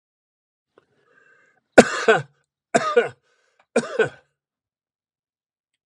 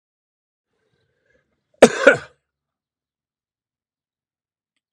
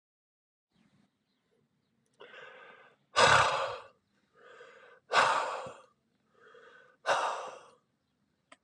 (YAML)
three_cough_length: 5.9 s
three_cough_amplitude: 32768
three_cough_signal_mean_std_ratio: 0.24
cough_length: 4.9 s
cough_amplitude: 32768
cough_signal_mean_std_ratio: 0.15
exhalation_length: 8.6 s
exhalation_amplitude: 11315
exhalation_signal_mean_std_ratio: 0.32
survey_phase: beta (2021-08-13 to 2022-03-07)
age: 65+
gender: Male
wearing_mask: 'No'
symptom_none: true
smoker_status: Ex-smoker
respiratory_condition_asthma: false
respiratory_condition_other: false
recruitment_source: REACT
submission_delay: 2 days
covid_test_result: Negative
covid_test_method: RT-qPCR
influenza_a_test_result: Negative
influenza_b_test_result: Negative